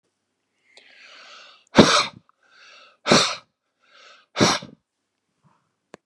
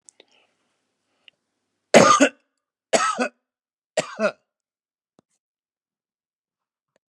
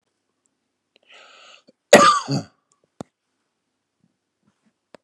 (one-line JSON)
{"exhalation_length": "6.1 s", "exhalation_amplitude": 32768, "exhalation_signal_mean_std_ratio": 0.27, "three_cough_length": "7.1 s", "three_cough_amplitude": 32768, "three_cough_signal_mean_std_ratio": 0.24, "cough_length": "5.0 s", "cough_amplitude": 32768, "cough_signal_mean_std_ratio": 0.21, "survey_phase": "beta (2021-08-13 to 2022-03-07)", "age": "45-64", "gender": "Male", "wearing_mask": "No", "symptom_none": true, "symptom_onset": "12 days", "smoker_status": "Never smoked", "respiratory_condition_asthma": false, "respiratory_condition_other": false, "recruitment_source": "REACT", "submission_delay": "2 days", "covid_test_result": "Negative", "covid_test_method": "RT-qPCR"}